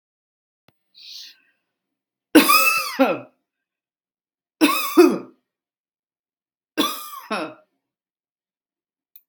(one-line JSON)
{"three_cough_length": "9.3 s", "three_cough_amplitude": 32768, "three_cough_signal_mean_std_ratio": 0.3, "survey_phase": "beta (2021-08-13 to 2022-03-07)", "age": "45-64", "gender": "Female", "wearing_mask": "No", "symptom_none": true, "smoker_status": "Never smoked", "respiratory_condition_asthma": false, "respiratory_condition_other": false, "recruitment_source": "REACT", "submission_delay": "0 days", "covid_test_result": "Negative", "covid_test_method": "RT-qPCR", "influenza_a_test_result": "Unknown/Void", "influenza_b_test_result": "Unknown/Void"}